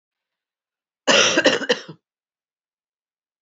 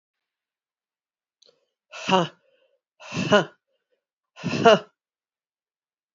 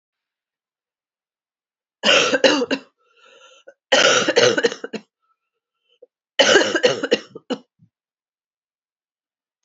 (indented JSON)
{
  "cough_length": "3.4 s",
  "cough_amplitude": 26020,
  "cough_signal_mean_std_ratio": 0.33,
  "exhalation_length": "6.1 s",
  "exhalation_amplitude": 26444,
  "exhalation_signal_mean_std_ratio": 0.24,
  "three_cough_length": "9.6 s",
  "three_cough_amplitude": 32767,
  "three_cough_signal_mean_std_ratio": 0.36,
  "survey_phase": "beta (2021-08-13 to 2022-03-07)",
  "age": "45-64",
  "gender": "Female",
  "wearing_mask": "No",
  "symptom_cough_any": true,
  "symptom_runny_or_blocked_nose": true,
  "symptom_sore_throat": true,
  "symptom_fatigue": true,
  "symptom_fever_high_temperature": true,
  "symptom_onset": "3 days",
  "smoker_status": "Never smoked",
  "respiratory_condition_asthma": false,
  "respiratory_condition_other": false,
  "recruitment_source": "Test and Trace",
  "submission_delay": "1 day",
  "covid_test_result": "Positive",
  "covid_test_method": "RT-qPCR",
  "covid_ct_value": 12.9,
  "covid_ct_gene": "ORF1ab gene",
  "covid_ct_mean": 13.5,
  "covid_viral_load": "37000000 copies/ml",
  "covid_viral_load_category": "High viral load (>1M copies/ml)"
}